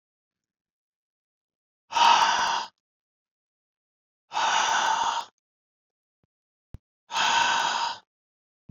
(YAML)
exhalation_length: 8.7 s
exhalation_amplitude: 15658
exhalation_signal_mean_std_ratio: 0.43
survey_phase: beta (2021-08-13 to 2022-03-07)
age: 65+
gender: Male
wearing_mask: 'No'
symptom_none: true
smoker_status: Ex-smoker
respiratory_condition_asthma: false
respiratory_condition_other: false
recruitment_source: REACT
submission_delay: 2 days
covid_test_result: Negative
covid_test_method: RT-qPCR
influenza_a_test_result: Negative
influenza_b_test_result: Negative